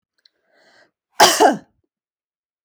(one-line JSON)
{"cough_length": "2.6 s", "cough_amplitude": 32017, "cough_signal_mean_std_ratio": 0.28, "survey_phase": "alpha (2021-03-01 to 2021-08-12)", "age": "45-64", "gender": "Female", "wearing_mask": "No", "symptom_none": true, "smoker_status": "Never smoked", "respiratory_condition_asthma": false, "respiratory_condition_other": false, "recruitment_source": "REACT", "submission_delay": "1 day", "covid_test_result": "Negative", "covid_test_method": "RT-qPCR"}